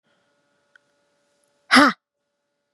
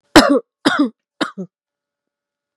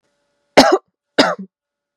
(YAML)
exhalation_length: 2.7 s
exhalation_amplitude: 32647
exhalation_signal_mean_std_ratio: 0.21
three_cough_length: 2.6 s
three_cough_amplitude: 32768
three_cough_signal_mean_std_ratio: 0.34
cough_length: 2.0 s
cough_amplitude: 32768
cough_signal_mean_std_ratio: 0.32
survey_phase: beta (2021-08-13 to 2022-03-07)
age: 18-44
gender: Female
wearing_mask: 'No'
symptom_none: true
smoker_status: Never smoked
respiratory_condition_asthma: false
respiratory_condition_other: false
recruitment_source: REACT
submission_delay: 0 days
covid_test_result: Negative
covid_test_method: RT-qPCR
influenza_a_test_result: Negative
influenza_b_test_result: Negative